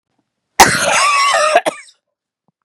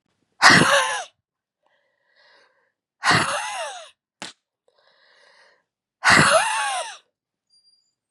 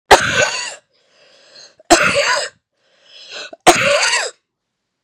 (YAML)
cough_length: 2.6 s
cough_amplitude: 32768
cough_signal_mean_std_ratio: 0.54
exhalation_length: 8.1 s
exhalation_amplitude: 32768
exhalation_signal_mean_std_ratio: 0.37
three_cough_length: 5.0 s
three_cough_amplitude: 32768
three_cough_signal_mean_std_ratio: 0.45
survey_phase: beta (2021-08-13 to 2022-03-07)
age: 45-64
gender: Female
wearing_mask: 'No'
symptom_runny_or_blocked_nose: true
symptom_fatigue: true
symptom_fever_high_temperature: true
symptom_headache: true
symptom_change_to_sense_of_smell_or_taste: true
symptom_loss_of_taste: true
symptom_other: true
symptom_onset: 3 days
smoker_status: Never smoked
respiratory_condition_asthma: false
respiratory_condition_other: false
recruitment_source: Test and Trace
submission_delay: 2 days
covid_test_result: Positive
covid_test_method: RT-qPCR
covid_ct_value: 18.8
covid_ct_gene: ORF1ab gene
covid_ct_mean: 19.2
covid_viral_load: 490000 copies/ml
covid_viral_load_category: Low viral load (10K-1M copies/ml)